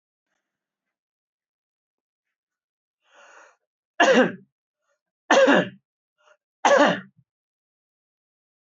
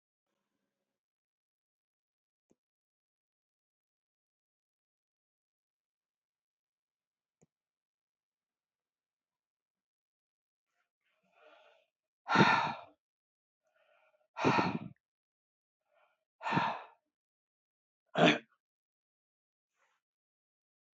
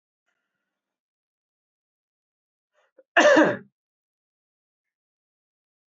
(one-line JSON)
{"three_cough_length": "8.8 s", "three_cough_amplitude": 20805, "three_cough_signal_mean_std_ratio": 0.27, "exhalation_length": "21.0 s", "exhalation_amplitude": 9085, "exhalation_signal_mean_std_ratio": 0.19, "cough_length": "5.9 s", "cough_amplitude": 21065, "cough_signal_mean_std_ratio": 0.2, "survey_phase": "beta (2021-08-13 to 2022-03-07)", "age": "65+", "gender": "Male", "wearing_mask": "No", "symptom_none": true, "smoker_status": "Ex-smoker", "respiratory_condition_asthma": false, "respiratory_condition_other": false, "recruitment_source": "REACT", "submission_delay": "1 day", "covid_test_result": "Negative", "covid_test_method": "RT-qPCR"}